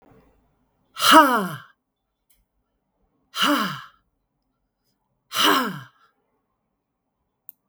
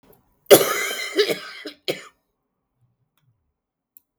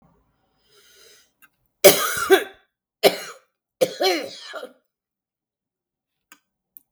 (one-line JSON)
{"exhalation_length": "7.7 s", "exhalation_amplitude": 32768, "exhalation_signal_mean_std_ratio": 0.29, "cough_length": "4.2 s", "cough_amplitude": 32767, "cough_signal_mean_std_ratio": 0.28, "three_cough_length": "6.9 s", "three_cough_amplitude": 32768, "three_cough_signal_mean_std_ratio": 0.26, "survey_phase": "beta (2021-08-13 to 2022-03-07)", "age": "45-64", "gender": "Female", "wearing_mask": "No", "symptom_none": true, "smoker_status": "Never smoked", "respiratory_condition_asthma": false, "respiratory_condition_other": false, "recruitment_source": "REACT", "submission_delay": "11 days", "covid_test_result": "Negative", "covid_test_method": "RT-qPCR", "influenza_a_test_result": "Unknown/Void", "influenza_b_test_result": "Unknown/Void"}